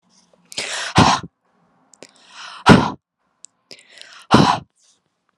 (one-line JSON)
{"exhalation_length": "5.4 s", "exhalation_amplitude": 32768, "exhalation_signal_mean_std_ratio": 0.31, "survey_phase": "alpha (2021-03-01 to 2021-08-12)", "age": "18-44", "gender": "Female", "wearing_mask": "No", "symptom_none": true, "smoker_status": "Never smoked", "respiratory_condition_asthma": false, "respiratory_condition_other": false, "recruitment_source": "REACT", "submission_delay": "3 days", "covid_test_result": "Negative", "covid_test_method": "RT-qPCR"}